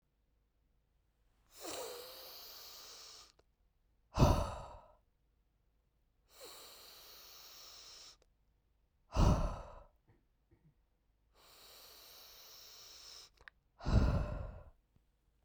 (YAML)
exhalation_length: 15.4 s
exhalation_amplitude: 5363
exhalation_signal_mean_std_ratio: 0.3
survey_phase: beta (2021-08-13 to 2022-03-07)
age: 18-44
gender: Female
wearing_mask: 'No'
symptom_cough_any: true
symptom_runny_or_blocked_nose: true
symptom_headache: true
symptom_change_to_sense_of_smell_or_taste: true
symptom_loss_of_taste: true
symptom_onset: 4 days
smoker_status: Never smoked
respiratory_condition_asthma: false
respiratory_condition_other: false
recruitment_source: Test and Trace
submission_delay: 1 day
covid_test_result: Positive
covid_test_method: RT-qPCR